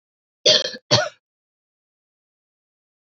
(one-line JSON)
{"cough_length": "3.1 s", "cough_amplitude": 28153, "cough_signal_mean_std_ratio": 0.26, "survey_phase": "beta (2021-08-13 to 2022-03-07)", "age": "18-44", "gender": "Female", "wearing_mask": "No", "symptom_cough_any": true, "symptom_runny_or_blocked_nose": true, "smoker_status": "Never smoked", "respiratory_condition_asthma": false, "respiratory_condition_other": false, "recruitment_source": "Test and Trace", "submission_delay": "2 days", "covid_test_result": "Positive", "covid_test_method": "RT-qPCR", "covid_ct_value": 16.7, "covid_ct_gene": "ORF1ab gene", "covid_ct_mean": 17.0, "covid_viral_load": "2600000 copies/ml", "covid_viral_load_category": "High viral load (>1M copies/ml)"}